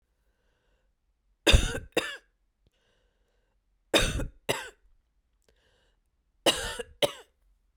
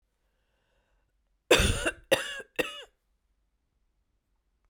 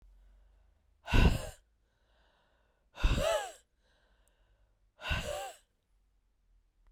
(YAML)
three_cough_length: 7.8 s
three_cough_amplitude: 17451
three_cough_signal_mean_std_ratio: 0.27
cough_length: 4.7 s
cough_amplitude: 17249
cough_signal_mean_std_ratio: 0.27
exhalation_length: 6.9 s
exhalation_amplitude: 8141
exhalation_signal_mean_std_ratio: 0.31
survey_phase: beta (2021-08-13 to 2022-03-07)
age: 45-64
gender: Female
wearing_mask: 'No'
symptom_cough_any: true
symptom_runny_or_blocked_nose: true
smoker_status: Never smoked
respiratory_condition_asthma: false
respiratory_condition_other: false
recruitment_source: Test and Trace
submission_delay: 2 days
covid_test_result: Positive
covid_test_method: RT-qPCR
covid_ct_value: 25.8
covid_ct_gene: N gene